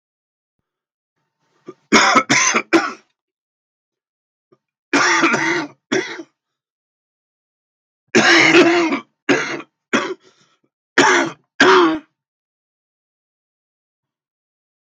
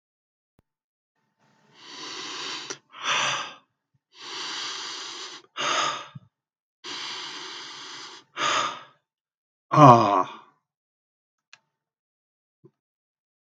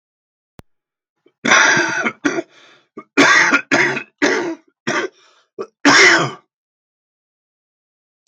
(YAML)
three_cough_length: 14.8 s
three_cough_amplitude: 32768
three_cough_signal_mean_std_ratio: 0.4
exhalation_length: 13.6 s
exhalation_amplitude: 32768
exhalation_signal_mean_std_ratio: 0.3
cough_length: 8.3 s
cough_amplitude: 32768
cough_signal_mean_std_ratio: 0.44
survey_phase: beta (2021-08-13 to 2022-03-07)
age: 65+
gender: Male
wearing_mask: 'No'
symptom_cough_any: true
symptom_new_continuous_cough: true
symptom_runny_or_blocked_nose: true
symptom_headache: true
symptom_onset: 4 days
smoker_status: Never smoked
respiratory_condition_asthma: false
respiratory_condition_other: false
recruitment_source: Test and Trace
submission_delay: 1 day
covid_test_result: Positive
covid_test_method: RT-qPCR
covid_ct_value: 21.4
covid_ct_gene: N gene